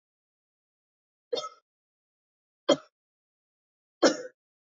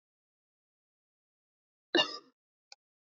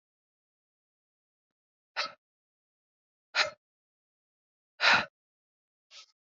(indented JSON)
{
  "three_cough_length": "4.6 s",
  "three_cough_amplitude": 13492,
  "three_cough_signal_mean_std_ratio": 0.19,
  "cough_length": "3.2 s",
  "cough_amplitude": 7593,
  "cough_signal_mean_std_ratio": 0.17,
  "exhalation_length": "6.2 s",
  "exhalation_amplitude": 10129,
  "exhalation_signal_mean_std_ratio": 0.2,
  "survey_phase": "beta (2021-08-13 to 2022-03-07)",
  "age": "18-44",
  "gender": "Female",
  "wearing_mask": "No",
  "symptom_cough_any": true,
  "symptom_runny_or_blocked_nose": true,
  "symptom_sore_throat": true,
  "smoker_status": "Never smoked",
  "respiratory_condition_asthma": false,
  "respiratory_condition_other": false,
  "recruitment_source": "Test and Trace",
  "submission_delay": "2 days",
  "covid_test_result": "Positive",
  "covid_test_method": "LFT"
}